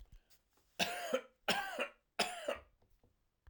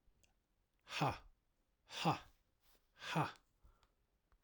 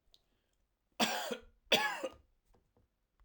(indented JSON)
{
  "three_cough_length": "3.5 s",
  "three_cough_amplitude": 4072,
  "three_cough_signal_mean_std_ratio": 0.44,
  "exhalation_length": "4.4 s",
  "exhalation_amplitude": 2410,
  "exhalation_signal_mean_std_ratio": 0.33,
  "cough_length": "3.2 s",
  "cough_amplitude": 5586,
  "cough_signal_mean_std_ratio": 0.34,
  "survey_phase": "alpha (2021-03-01 to 2021-08-12)",
  "age": "45-64",
  "gender": "Male",
  "wearing_mask": "No",
  "symptom_cough_any": true,
  "symptom_change_to_sense_of_smell_or_taste": true,
  "symptom_loss_of_taste": true,
  "smoker_status": "Never smoked",
  "respiratory_condition_asthma": false,
  "respiratory_condition_other": false,
  "recruitment_source": "Test and Trace",
  "submission_delay": "2 days",
  "covid_test_result": "Positive",
  "covid_test_method": "LFT"
}